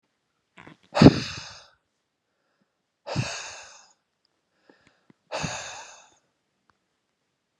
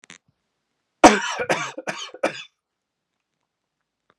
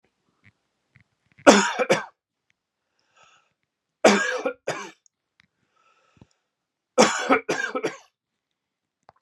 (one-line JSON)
{"exhalation_length": "7.6 s", "exhalation_amplitude": 32768, "exhalation_signal_mean_std_ratio": 0.19, "cough_length": "4.2 s", "cough_amplitude": 32768, "cough_signal_mean_std_ratio": 0.24, "three_cough_length": "9.2 s", "three_cough_amplitude": 32768, "three_cough_signal_mean_std_ratio": 0.29, "survey_phase": "beta (2021-08-13 to 2022-03-07)", "age": "45-64", "gender": "Male", "wearing_mask": "No", "symptom_none": true, "symptom_onset": "7 days", "smoker_status": "Ex-smoker", "respiratory_condition_asthma": false, "respiratory_condition_other": false, "recruitment_source": "REACT", "submission_delay": "1 day", "covid_test_result": "Negative", "covid_test_method": "RT-qPCR", "influenza_a_test_result": "Negative", "influenza_b_test_result": "Negative"}